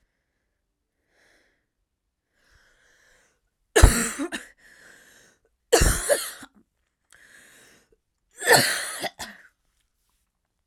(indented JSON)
{
  "three_cough_length": "10.7 s",
  "three_cough_amplitude": 32767,
  "three_cough_signal_mean_std_ratio": 0.26,
  "survey_phase": "beta (2021-08-13 to 2022-03-07)",
  "age": "18-44",
  "gender": "Female",
  "wearing_mask": "No",
  "symptom_runny_or_blocked_nose": true,
  "symptom_sore_throat": true,
  "symptom_fatigue": true,
  "symptom_change_to_sense_of_smell_or_taste": true,
  "symptom_loss_of_taste": true,
  "smoker_status": "Never smoked",
  "respiratory_condition_asthma": true,
  "respiratory_condition_other": false,
  "recruitment_source": "Test and Trace",
  "submission_delay": "2 days",
  "covid_test_result": "Positive",
  "covid_test_method": "RT-qPCR",
  "covid_ct_value": 22.6,
  "covid_ct_gene": "ORF1ab gene",
  "covid_ct_mean": 23.0,
  "covid_viral_load": "28000 copies/ml",
  "covid_viral_load_category": "Low viral load (10K-1M copies/ml)"
}